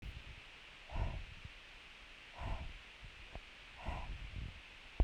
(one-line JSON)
{"exhalation_length": "5.0 s", "exhalation_amplitude": 3744, "exhalation_signal_mean_std_ratio": 0.59, "survey_phase": "beta (2021-08-13 to 2022-03-07)", "age": "45-64", "gender": "Female", "wearing_mask": "No", "symptom_none": true, "smoker_status": "Never smoked", "respiratory_condition_asthma": true, "respiratory_condition_other": false, "recruitment_source": "REACT", "submission_delay": "2 days", "covid_test_result": "Negative", "covid_test_method": "RT-qPCR", "influenza_a_test_result": "Negative", "influenza_b_test_result": "Negative"}